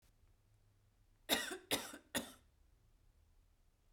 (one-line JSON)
{"three_cough_length": "3.9 s", "three_cough_amplitude": 3338, "three_cough_signal_mean_std_ratio": 0.31, "survey_phase": "beta (2021-08-13 to 2022-03-07)", "age": "18-44", "gender": "Female", "wearing_mask": "No", "symptom_cough_any": true, "smoker_status": "Ex-smoker", "respiratory_condition_asthma": false, "respiratory_condition_other": false, "recruitment_source": "Test and Trace", "submission_delay": "1 day", "covid_test_result": "Negative", "covid_test_method": "RT-qPCR"}